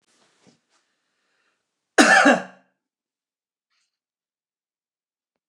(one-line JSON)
{"cough_length": "5.5 s", "cough_amplitude": 29203, "cough_signal_mean_std_ratio": 0.22, "survey_phase": "beta (2021-08-13 to 2022-03-07)", "age": "65+", "gender": "Male", "wearing_mask": "No", "symptom_none": true, "smoker_status": "Never smoked", "respiratory_condition_asthma": false, "respiratory_condition_other": false, "recruitment_source": "REACT", "submission_delay": "-1 day", "covid_test_result": "Negative", "covid_test_method": "RT-qPCR", "influenza_a_test_result": "Negative", "influenza_b_test_result": "Negative"}